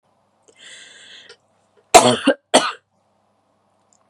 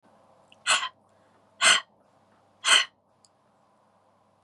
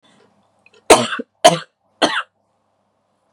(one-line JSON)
{"cough_length": "4.1 s", "cough_amplitude": 32768, "cough_signal_mean_std_ratio": 0.25, "exhalation_length": "4.4 s", "exhalation_amplitude": 16893, "exhalation_signal_mean_std_ratio": 0.28, "three_cough_length": "3.3 s", "three_cough_amplitude": 32768, "three_cough_signal_mean_std_ratio": 0.27, "survey_phase": "beta (2021-08-13 to 2022-03-07)", "age": "18-44", "gender": "Female", "wearing_mask": "No", "symptom_none": true, "smoker_status": "Never smoked", "respiratory_condition_asthma": false, "respiratory_condition_other": false, "recruitment_source": "REACT", "submission_delay": "3 days", "covid_test_result": "Negative", "covid_test_method": "RT-qPCR", "influenza_a_test_result": "Negative", "influenza_b_test_result": "Negative"}